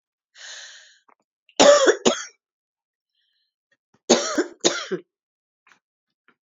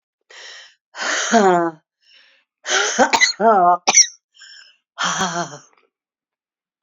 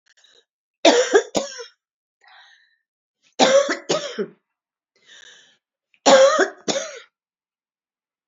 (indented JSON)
{
  "cough_length": "6.6 s",
  "cough_amplitude": 28867,
  "cough_signal_mean_std_ratio": 0.29,
  "exhalation_length": "6.8 s",
  "exhalation_amplitude": 30607,
  "exhalation_signal_mean_std_ratio": 0.46,
  "three_cough_length": "8.3 s",
  "three_cough_amplitude": 28903,
  "three_cough_signal_mean_std_ratio": 0.35,
  "survey_phase": "alpha (2021-03-01 to 2021-08-12)",
  "age": "65+",
  "gender": "Female",
  "wearing_mask": "No",
  "symptom_cough_any": true,
  "symptom_shortness_of_breath": true,
  "symptom_fatigue": true,
  "symptom_headache": true,
  "symptom_change_to_sense_of_smell_or_taste": true,
  "symptom_loss_of_taste": true,
  "symptom_onset": "2 days",
  "smoker_status": "Ex-smoker",
  "respiratory_condition_asthma": true,
  "respiratory_condition_other": false,
  "recruitment_source": "Test and Trace",
  "submission_delay": "1 day",
  "covid_test_result": "Positive",
  "covid_test_method": "RT-qPCR",
  "covid_ct_value": 19.2,
  "covid_ct_gene": "ORF1ab gene",
  "covid_ct_mean": 19.6,
  "covid_viral_load": "370000 copies/ml",
  "covid_viral_load_category": "Low viral load (10K-1M copies/ml)"
}